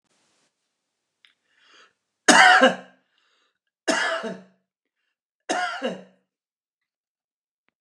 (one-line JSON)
{"three_cough_length": "7.8 s", "three_cough_amplitude": 29203, "three_cough_signal_mean_std_ratio": 0.27, "survey_phase": "beta (2021-08-13 to 2022-03-07)", "age": "65+", "gender": "Male", "wearing_mask": "No", "symptom_none": true, "smoker_status": "Never smoked", "respiratory_condition_asthma": false, "respiratory_condition_other": false, "recruitment_source": "REACT", "submission_delay": "-1 day", "covid_test_result": "Negative", "covid_test_method": "RT-qPCR", "influenza_a_test_result": "Negative", "influenza_b_test_result": "Negative"}